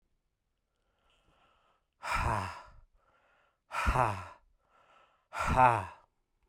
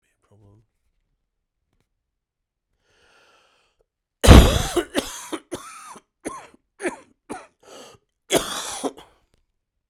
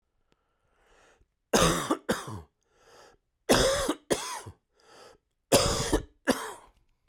{"exhalation_length": "6.5 s", "exhalation_amplitude": 10445, "exhalation_signal_mean_std_ratio": 0.35, "cough_length": "9.9 s", "cough_amplitude": 32768, "cough_signal_mean_std_ratio": 0.22, "three_cough_length": "7.1 s", "three_cough_amplitude": 14583, "three_cough_signal_mean_std_ratio": 0.4, "survey_phase": "beta (2021-08-13 to 2022-03-07)", "age": "18-44", "gender": "Male", "wearing_mask": "No", "symptom_cough_any": true, "symptom_new_continuous_cough": true, "symptom_runny_or_blocked_nose": true, "symptom_shortness_of_breath": true, "symptom_abdominal_pain": true, "symptom_fatigue": true, "symptom_fever_high_temperature": true, "symptom_change_to_sense_of_smell_or_taste": true, "symptom_onset": "4 days", "smoker_status": "Never smoked", "respiratory_condition_asthma": false, "respiratory_condition_other": false, "recruitment_source": "Test and Trace", "submission_delay": "3 days", "covid_test_result": "Positive", "covid_test_method": "RT-qPCR", "covid_ct_value": 15.0, "covid_ct_gene": "ORF1ab gene", "covid_ct_mean": 15.4, "covid_viral_load": "8600000 copies/ml", "covid_viral_load_category": "High viral load (>1M copies/ml)"}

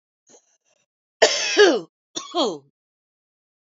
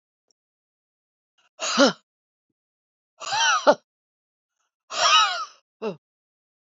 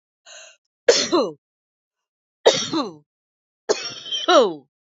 {"cough_length": "3.7 s", "cough_amplitude": 27932, "cough_signal_mean_std_ratio": 0.34, "exhalation_length": "6.7 s", "exhalation_amplitude": 23891, "exhalation_signal_mean_std_ratio": 0.32, "three_cough_length": "4.9 s", "three_cough_amplitude": 27314, "three_cough_signal_mean_std_ratio": 0.38, "survey_phase": "beta (2021-08-13 to 2022-03-07)", "age": "45-64", "gender": "Female", "wearing_mask": "No", "symptom_cough_any": true, "symptom_fatigue": true, "symptom_onset": "10 days", "smoker_status": "Ex-smoker", "respiratory_condition_asthma": false, "respiratory_condition_other": false, "recruitment_source": "REACT", "submission_delay": "2 days", "covid_test_result": "Negative", "covid_test_method": "RT-qPCR", "influenza_a_test_result": "Negative", "influenza_b_test_result": "Negative"}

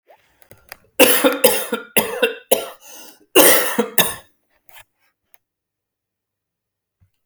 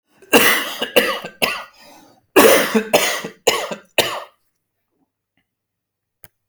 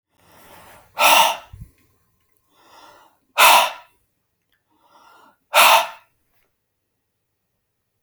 {"three_cough_length": "7.3 s", "three_cough_amplitude": 32768, "three_cough_signal_mean_std_ratio": 0.36, "cough_length": "6.5 s", "cough_amplitude": 32768, "cough_signal_mean_std_ratio": 0.42, "exhalation_length": "8.0 s", "exhalation_amplitude": 32768, "exhalation_signal_mean_std_ratio": 0.29, "survey_phase": "beta (2021-08-13 to 2022-03-07)", "age": "45-64", "gender": "Male", "wearing_mask": "No", "symptom_none": true, "smoker_status": "Ex-smoker", "respiratory_condition_asthma": false, "respiratory_condition_other": false, "recruitment_source": "REACT", "submission_delay": "1 day", "covid_test_result": "Negative", "covid_test_method": "RT-qPCR"}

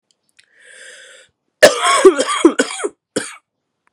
{"three_cough_length": "3.9 s", "three_cough_amplitude": 32768, "three_cough_signal_mean_std_ratio": 0.37, "survey_phase": "beta (2021-08-13 to 2022-03-07)", "age": "18-44", "gender": "Female", "wearing_mask": "No", "symptom_cough_any": true, "symptom_runny_or_blocked_nose": true, "symptom_shortness_of_breath": true, "symptom_sore_throat": true, "symptom_abdominal_pain": true, "symptom_fatigue": true, "symptom_fever_high_temperature": true, "symptom_headache": true, "symptom_change_to_sense_of_smell_or_taste": true, "symptom_loss_of_taste": true, "symptom_onset": "7 days", "smoker_status": "Never smoked", "respiratory_condition_asthma": false, "respiratory_condition_other": false, "recruitment_source": "Test and Trace", "submission_delay": "2 days", "covid_test_result": "Positive", "covid_test_method": "RT-qPCR", "covid_ct_value": 21.4, "covid_ct_gene": "ORF1ab gene"}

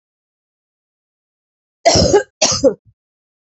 {"cough_length": "3.5 s", "cough_amplitude": 32767, "cough_signal_mean_std_ratio": 0.34, "survey_phase": "beta (2021-08-13 to 2022-03-07)", "age": "45-64", "gender": "Female", "wearing_mask": "No", "symptom_cough_any": true, "symptom_runny_or_blocked_nose": true, "symptom_shortness_of_breath": true, "symptom_sore_throat": true, "symptom_fatigue": true, "symptom_headache": true, "symptom_change_to_sense_of_smell_or_taste": true, "smoker_status": "Ex-smoker", "respiratory_condition_asthma": false, "respiratory_condition_other": false, "recruitment_source": "Test and Trace", "submission_delay": "2 days", "covid_test_result": "Positive", "covid_test_method": "LFT"}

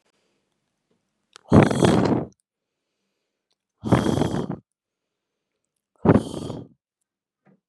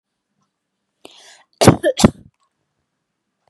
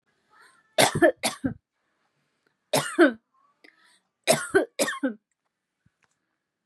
{"exhalation_length": "7.7 s", "exhalation_amplitude": 29252, "exhalation_signal_mean_std_ratio": 0.32, "cough_length": "3.5 s", "cough_amplitude": 32768, "cough_signal_mean_std_ratio": 0.22, "three_cough_length": "6.7 s", "three_cough_amplitude": 25346, "three_cough_signal_mean_std_ratio": 0.32, "survey_phase": "beta (2021-08-13 to 2022-03-07)", "age": "18-44", "gender": "Female", "wearing_mask": "No", "symptom_none": true, "smoker_status": "Ex-smoker", "respiratory_condition_asthma": false, "respiratory_condition_other": false, "recruitment_source": "Test and Trace", "submission_delay": "0 days", "covid_test_result": "Negative", "covid_test_method": "RT-qPCR"}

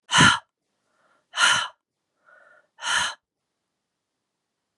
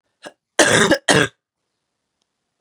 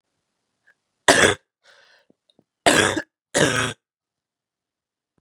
{"exhalation_length": "4.8 s", "exhalation_amplitude": 25068, "exhalation_signal_mean_std_ratio": 0.31, "cough_length": "2.6 s", "cough_amplitude": 32683, "cough_signal_mean_std_ratio": 0.36, "three_cough_length": "5.2 s", "three_cough_amplitude": 32767, "three_cough_signal_mean_std_ratio": 0.3, "survey_phase": "beta (2021-08-13 to 2022-03-07)", "age": "18-44", "gender": "Female", "wearing_mask": "No", "symptom_new_continuous_cough": true, "symptom_runny_or_blocked_nose": true, "symptom_sore_throat": true, "symptom_fatigue": true, "symptom_loss_of_taste": true, "symptom_onset": "3 days", "smoker_status": "Never smoked", "respiratory_condition_asthma": false, "respiratory_condition_other": false, "recruitment_source": "Test and Trace", "submission_delay": "1 day", "covid_test_result": "Positive", "covid_test_method": "RT-qPCR", "covid_ct_value": 22.2, "covid_ct_gene": "ORF1ab gene", "covid_ct_mean": 22.3, "covid_viral_load": "47000 copies/ml", "covid_viral_load_category": "Low viral load (10K-1M copies/ml)"}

